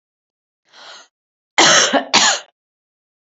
{"cough_length": "3.2 s", "cough_amplitude": 32768, "cough_signal_mean_std_ratio": 0.38, "survey_phase": "beta (2021-08-13 to 2022-03-07)", "age": "18-44", "gender": "Female", "wearing_mask": "No", "symptom_cough_any": true, "symptom_runny_or_blocked_nose": true, "symptom_sore_throat": true, "symptom_fatigue": true, "symptom_change_to_sense_of_smell_or_taste": true, "symptom_onset": "4 days", "smoker_status": "Never smoked", "respiratory_condition_asthma": false, "respiratory_condition_other": false, "recruitment_source": "Test and Trace", "submission_delay": "2 days", "covid_test_result": "Positive", "covid_test_method": "RT-qPCR", "covid_ct_value": 22.2, "covid_ct_gene": "ORF1ab gene", "covid_ct_mean": 23.1, "covid_viral_load": "26000 copies/ml", "covid_viral_load_category": "Low viral load (10K-1M copies/ml)"}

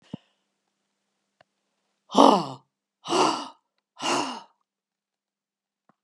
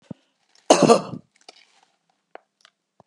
{"exhalation_length": "6.0 s", "exhalation_amplitude": 31420, "exhalation_signal_mean_std_ratio": 0.27, "cough_length": "3.1 s", "cough_amplitude": 32620, "cough_signal_mean_std_ratio": 0.24, "survey_phase": "beta (2021-08-13 to 2022-03-07)", "age": "65+", "gender": "Female", "wearing_mask": "No", "symptom_none": true, "smoker_status": "Ex-smoker", "respiratory_condition_asthma": false, "respiratory_condition_other": false, "recruitment_source": "REACT", "submission_delay": "1 day", "covid_test_result": "Negative", "covid_test_method": "RT-qPCR", "influenza_a_test_result": "Negative", "influenza_b_test_result": "Negative"}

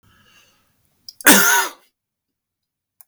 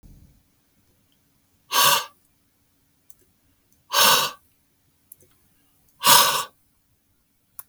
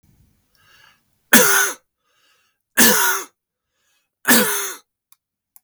{"cough_length": "3.1 s", "cough_amplitude": 32768, "cough_signal_mean_std_ratio": 0.29, "exhalation_length": "7.7 s", "exhalation_amplitude": 32766, "exhalation_signal_mean_std_ratio": 0.29, "three_cough_length": "5.6 s", "three_cough_amplitude": 32768, "three_cough_signal_mean_std_ratio": 0.37, "survey_phase": "beta (2021-08-13 to 2022-03-07)", "age": "65+", "gender": "Male", "wearing_mask": "No", "symptom_cough_any": true, "symptom_runny_or_blocked_nose": true, "smoker_status": "Ex-smoker", "respiratory_condition_asthma": false, "respiratory_condition_other": false, "recruitment_source": "REACT", "submission_delay": "1 day", "covid_test_result": "Negative", "covid_test_method": "RT-qPCR", "influenza_a_test_result": "Negative", "influenza_b_test_result": "Negative"}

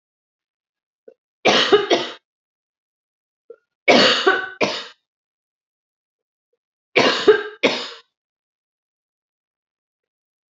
{"three_cough_length": "10.5 s", "three_cough_amplitude": 27246, "three_cough_signal_mean_std_ratio": 0.32, "survey_phase": "beta (2021-08-13 to 2022-03-07)", "age": "45-64", "gender": "Female", "wearing_mask": "No", "symptom_none": true, "smoker_status": "Never smoked", "respiratory_condition_asthma": false, "respiratory_condition_other": false, "recruitment_source": "REACT", "submission_delay": "1 day", "covid_test_result": "Negative", "covid_test_method": "RT-qPCR", "influenza_a_test_result": "Negative", "influenza_b_test_result": "Negative"}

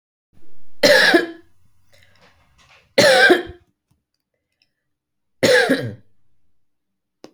{"three_cough_length": "7.3 s", "three_cough_amplitude": 28833, "three_cough_signal_mean_std_ratio": 0.39, "survey_phase": "beta (2021-08-13 to 2022-03-07)", "age": "45-64", "gender": "Female", "wearing_mask": "No", "symptom_none": true, "smoker_status": "Current smoker (1 to 10 cigarettes per day)", "respiratory_condition_asthma": false, "respiratory_condition_other": false, "recruitment_source": "REACT", "submission_delay": "5 days", "covid_test_result": "Negative", "covid_test_method": "RT-qPCR"}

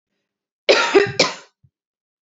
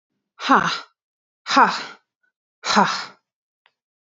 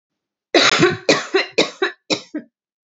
{"cough_length": "2.2 s", "cough_amplitude": 29298, "cough_signal_mean_std_ratio": 0.37, "exhalation_length": "4.1 s", "exhalation_amplitude": 28104, "exhalation_signal_mean_std_ratio": 0.35, "three_cough_length": "3.0 s", "three_cough_amplitude": 31695, "three_cough_signal_mean_std_ratio": 0.46, "survey_phase": "beta (2021-08-13 to 2022-03-07)", "age": "18-44", "gender": "Female", "wearing_mask": "No", "symptom_none": true, "smoker_status": "Never smoked", "respiratory_condition_asthma": false, "respiratory_condition_other": false, "recruitment_source": "REACT", "submission_delay": "0 days", "covid_test_result": "Negative", "covid_test_method": "RT-qPCR"}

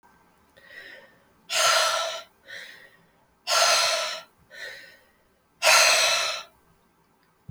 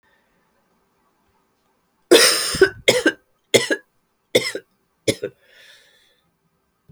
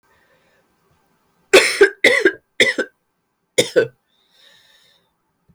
{"exhalation_length": "7.5 s", "exhalation_amplitude": 20218, "exhalation_signal_mean_std_ratio": 0.46, "three_cough_length": "6.9 s", "three_cough_amplitude": 32767, "three_cough_signal_mean_std_ratio": 0.3, "cough_length": "5.5 s", "cough_amplitude": 32767, "cough_signal_mean_std_ratio": 0.31, "survey_phase": "alpha (2021-03-01 to 2021-08-12)", "age": "45-64", "gender": "Female", "wearing_mask": "No", "symptom_cough_any": true, "symptom_fatigue": true, "symptom_fever_high_temperature": true, "symptom_change_to_sense_of_smell_or_taste": true, "smoker_status": "Never smoked", "respiratory_condition_asthma": false, "respiratory_condition_other": false, "recruitment_source": "Test and Trace", "submission_delay": "3 days", "covid_test_result": "Positive", "covid_test_method": "LFT"}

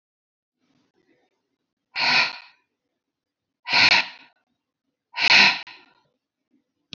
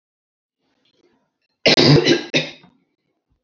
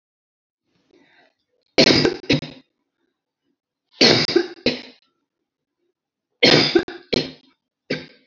{"exhalation_length": "7.0 s", "exhalation_amplitude": 24892, "exhalation_signal_mean_std_ratio": 0.31, "cough_length": "3.4 s", "cough_amplitude": 29479, "cough_signal_mean_std_ratio": 0.34, "three_cough_length": "8.3 s", "three_cough_amplitude": 30871, "three_cough_signal_mean_std_ratio": 0.33, "survey_phase": "beta (2021-08-13 to 2022-03-07)", "age": "65+", "gender": "Female", "wearing_mask": "No", "symptom_cough_any": true, "symptom_runny_or_blocked_nose": true, "symptom_shortness_of_breath": true, "smoker_status": "Ex-smoker", "respiratory_condition_asthma": false, "respiratory_condition_other": true, "recruitment_source": "REACT", "submission_delay": "2 days", "covid_test_result": "Negative", "covid_test_method": "RT-qPCR"}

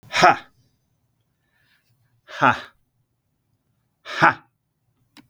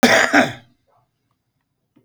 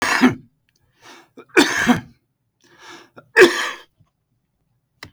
{"exhalation_length": "5.3 s", "exhalation_amplitude": 32768, "exhalation_signal_mean_std_ratio": 0.24, "cough_length": "2.0 s", "cough_amplitude": 32768, "cough_signal_mean_std_ratio": 0.37, "three_cough_length": "5.1 s", "three_cough_amplitude": 30902, "three_cough_signal_mean_std_ratio": 0.33, "survey_phase": "beta (2021-08-13 to 2022-03-07)", "age": "45-64", "gender": "Male", "wearing_mask": "No", "symptom_none": true, "smoker_status": "Current smoker (11 or more cigarettes per day)", "respiratory_condition_asthma": false, "respiratory_condition_other": false, "recruitment_source": "REACT", "submission_delay": "5 days", "covid_test_result": "Negative", "covid_test_method": "RT-qPCR", "influenza_a_test_result": "Unknown/Void", "influenza_b_test_result": "Unknown/Void"}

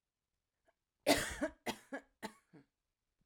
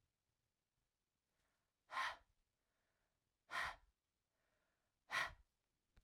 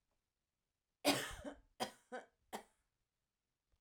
{"cough_length": "3.3 s", "cough_amplitude": 5289, "cough_signal_mean_std_ratio": 0.28, "exhalation_length": "6.0 s", "exhalation_amplitude": 1176, "exhalation_signal_mean_std_ratio": 0.27, "three_cough_length": "3.8 s", "three_cough_amplitude": 3988, "three_cough_signal_mean_std_ratio": 0.27, "survey_phase": "alpha (2021-03-01 to 2021-08-12)", "age": "18-44", "gender": "Female", "wearing_mask": "No", "symptom_fatigue": true, "symptom_headache": true, "symptom_onset": "8 days", "smoker_status": "Never smoked", "respiratory_condition_asthma": false, "respiratory_condition_other": false, "recruitment_source": "REACT", "submission_delay": "2 days", "covid_test_result": "Negative", "covid_test_method": "RT-qPCR"}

